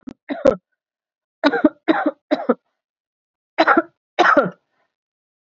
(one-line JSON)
{"cough_length": "5.5 s", "cough_amplitude": 32767, "cough_signal_mean_std_ratio": 0.35, "survey_phase": "beta (2021-08-13 to 2022-03-07)", "age": "45-64", "gender": "Female", "wearing_mask": "No", "symptom_none": true, "smoker_status": "Current smoker (1 to 10 cigarettes per day)", "respiratory_condition_asthma": false, "respiratory_condition_other": false, "recruitment_source": "REACT", "submission_delay": "13 days", "covid_test_result": "Negative", "covid_test_method": "RT-qPCR", "influenza_a_test_result": "Negative", "influenza_b_test_result": "Negative"}